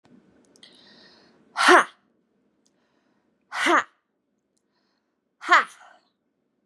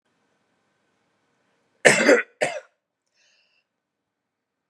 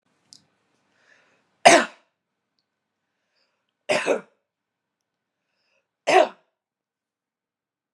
{"exhalation_length": "6.7 s", "exhalation_amplitude": 30221, "exhalation_signal_mean_std_ratio": 0.24, "cough_length": "4.7 s", "cough_amplitude": 32768, "cough_signal_mean_std_ratio": 0.23, "three_cough_length": "7.9 s", "three_cough_amplitude": 32767, "three_cough_signal_mean_std_ratio": 0.2, "survey_phase": "beta (2021-08-13 to 2022-03-07)", "age": "18-44", "gender": "Female", "wearing_mask": "No", "symptom_none": true, "symptom_onset": "12 days", "smoker_status": "Ex-smoker", "respiratory_condition_asthma": false, "respiratory_condition_other": false, "recruitment_source": "REACT", "submission_delay": "2 days", "covid_test_result": "Negative", "covid_test_method": "RT-qPCR", "influenza_a_test_result": "Negative", "influenza_b_test_result": "Negative"}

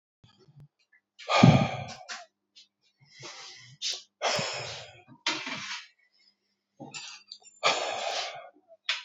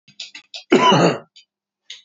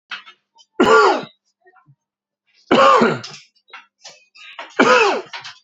{"exhalation_length": "9.0 s", "exhalation_amplitude": 23497, "exhalation_signal_mean_std_ratio": 0.36, "cough_length": "2.0 s", "cough_amplitude": 28756, "cough_signal_mean_std_ratio": 0.42, "three_cough_length": "5.6 s", "three_cough_amplitude": 29970, "three_cough_signal_mean_std_ratio": 0.42, "survey_phase": "alpha (2021-03-01 to 2021-08-12)", "age": "18-44", "gender": "Male", "wearing_mask": "No", "symptom_none": true, "smoker_status": "Never smoked", "respiratory_condition_asthma": false, "respiratory_condition_other": false, "recruitment_source": "REACT", "submission_delay": "3 days", "covid_test_result": "Negative", "covid_test_method": "RT-qPCR"}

